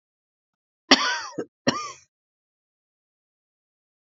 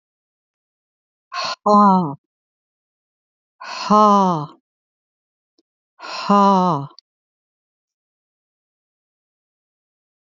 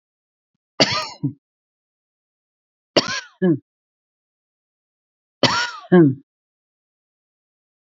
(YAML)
cough_length: 4.1 s
cough_amplitude: 29635
cough_signal_mean_std_ratio: 0.23
exhalation_length: 10.3 s
exhalation_amplitude: 28687
exhalation_signal_mean_std_ratio: 0.32
three_cough_length: 7.9 s
three_cough_amplitude: 30315
three_cough_signal_mean_std_ratio: 0.27
survey_phase: beta (2021-08-13 to 2022-03-07)
age: 65+
gender: Female
wearing_mask: 'No'
symptom_none: true
smoker_status: Ex-smoker
respiratory_condition_asthma: false
respiratory_condition_other: false
recruitment_source: REACT
submission_delay: 1 day
covid_test_result: Negative
covid_test_method: RT-qPCR
influenza_a_test_result: Negative
influenza_b_test_result: Negative